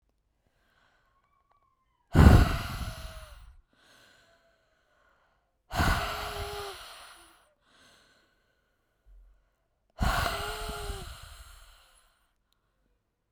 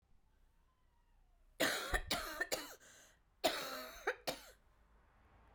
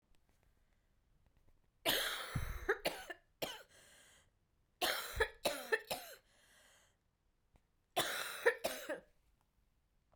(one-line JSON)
{"exhalation_length": "13.3 s", "exhalation_amplitude": 18172, "exhalation_signal_mean_std_ratio": 0.27, "cough_length": "5.5 s", "cough_amplitude": 3070, "cough_signal_mean_std_ratio": 0.43, "three_cough_length": "10.2 s", "three_cough_amplitude": 3994, "three_cough_signal_mean_std_ratio": 0.39, "survey_phase": "beta (2021-08-13 to 2022-03-07)", "age": "45-64", "gender": "Female", "wearing_mask": "No", "symptom_cough_any": true, "symptom_runny_or_blocked_nose": true, "symptom_sore_throat": true, "symptom_fatigue": true, "symptom_headache": true, "symptom_change_to_sense_of_smell_or_taste": true, "symptom_onset": "3 days", "smoker_status": "Never smoked", "respiratory_condition_asthma": false, "respiratory_condition_other": false, "recruitment_source": "Test and Trace", "submission_delay": "1 day", "covid_test_result": "Positive", "covid_test_method": "RT-qPCR", "covid_ct_value": 23.3, "covid_ct_gene": "ORF1ab gene"}